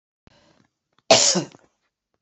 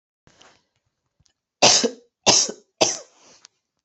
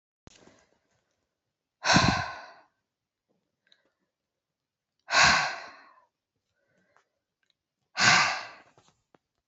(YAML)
cough_length: 2.2 s
cough_amplitude: 31671
cough_signal_mean_std_ratio: 0.28
three_cough_length: 3.8 s
three_cough_amplitude: 32767
three_cough_signal_mean_std_ratio: 0.31
exhalation_length: 9.5 s
exhalation_amplitude: 18959
exhalation_signal_mean_std_ratio: 0.29
survey_phase: beta (2021-08-13 to 2022-03-07)
age: 45-64
gender: Female
wearing_mask: 'No'
symptom_cough_any: true
symptom_runny_or_blocked_nose: true
symptom_sore_throat: true
symptom_fatigue: true
symptom_headache: true
symptom_onset: 4 days
smoker_status: Ex-smoker
respiratory_condition_asthma: false
respiratory_condition_other: false
recruitment_source: Test and Trace
submission_delay: 2 days
covid_test_result: Positive
covid_test_method: RT-qPCR
covid_ct_value: 31.0
covid_ct_gene: S gene